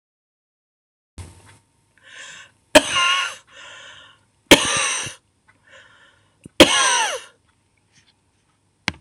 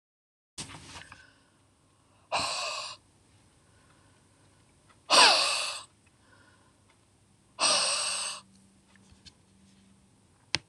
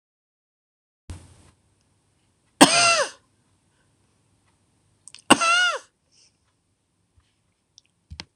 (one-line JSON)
{"three_cough_length": "9.0 s", "three_cough_amplitude": 26028, "three_cough_signal_mean_std_ratio": 0.3, "exhalation_length": "10.7 s", "exhalation_amplitude": 20677, "exhalation_signal_mean_std_ratio": 0.32, "cough_length": "8.4 s", "cough_amplitude": 26028, "cough_signal_mean_std_ratio": 0.24, "survey_phase": "alpha (2021-03-01 to 2021-08-12)", "age": "65+", "gender": "Female", "wearing_mask": "No", "symptom_none": true, "smoker_status": "Ex-smoker", "respiratory_condition_asthma": false, "respiratory_condition_other": false, "recruitment_source": "REACT", "submission_delay": "1 day", "covid_test_result": "Negative", "covid_test_method": "RT-qPCR"}